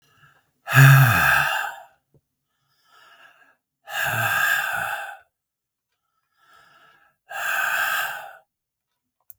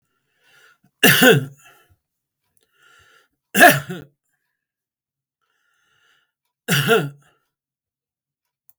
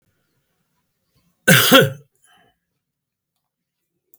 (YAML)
exhalation_length: 9.4 s
exhalation_amplitude: 32506
exhalation_signal_mean_std_ratio: 0.4
three_cough_length: 8.8 s
three_cough_amplitude: 32768
three_cough_signal_mean_std_ratio: 0.26
cough_length: 4.2 s
cough_amplitude: 32768
cough_signal_mean_std_ratio: 0.25
survey_phase: beta (2021-08-13 to 2022-03-07)
age: 65+
gender: Male
wearing_mask: 'No'
symptom_runny_or_blocked_nose: true
symptom_onset: 12 days
smoker_status: Ex-smoker
respiratory_condition_asthma: false
respiratory_condition_other: false
recruitment_source: REACT
submission_delay: 2 days
covid_test_result: Negative
covid_test_method: RT-qPCR
influenza_a_test_result: Negative
influenza_b_test_result: Negative